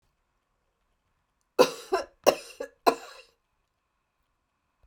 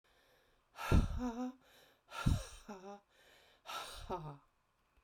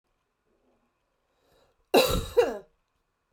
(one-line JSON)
{"three_cough_length": "4.9 s", "three_cough_amplitude": 25441, "three_cough_signal_mean_std_ratio": 0.21, "exhalation_length": "5.0 s", "exhalation_amplitude": 4164, "exhalation_signal_mean_std_ratio": 0.39, "cough_length": "3.3 s", "cough_amplitude": 14790, "cough_signal_mean_std_ratio": 0.29, "survey_phase": "beta (2021-08-13 to 2022-03-07)", "age": "45-64", "gender": "Female", "wearing_mask": "No", "symptom_none": true, "smoker_status": "Ex-smoker", "respiratory_condition_asthma": false, "respiratory_condition_other": false, "recruitment_source": "REACT", "submission_delay": "4 days", "covid_test_result": "Negative", "covid_test_method": "RT-qPCR"}